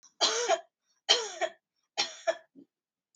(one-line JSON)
{"three_cough_length": "3.2 s", "three_cough_amplitude": 13864, "three_cough_signal_mean_std_ratio": 0.4, "survey_phase": "beta (2021-08-13 to 2022-03-07)", "age": "18-44", "gender": "Female", "wearing_mask": "No", "symptom_cough_any": true, "symptom_runny_or_blocked_nose": true, "symptom_sore_throat": true, "symptom_onset": "5 days", "smoker_status": "Never smoked", "respiratory_condition_asthma": false, "respiratory_condition_other": false, "recruitment_source": "REACT", "submission_delay": "1 day", "covid_test_result": "Negative", "covid_test_method": "RT-qPCR", "influenza_a_test_result": "Unknown/Void", "influenza_b_test_result": "Unknown/Void"}